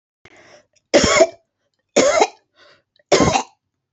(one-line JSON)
{"three_cough_length": "3.9 s", "three_cough_amplitude": 32499, "three_cough_signal_mean_std_ratio": 0.4, "survey_phase": "beta (2021-08-13 to 2022-03-07)", "age": "45-64", "gender": "Female", "wearing_mask": "No", "symptom_none": true, "smoker_status": "Never smoked", "respiratory_condition_asthma": false, "respiratory_condition_other": false, "recruitment_source": "REACT", "submission_delay": "4 days", "covid_test_result": "Negative", "covid_test_method": "RT-qPCR", "influenza_a_test_result": "Negative", "influenza_b_test_result": "Negative"}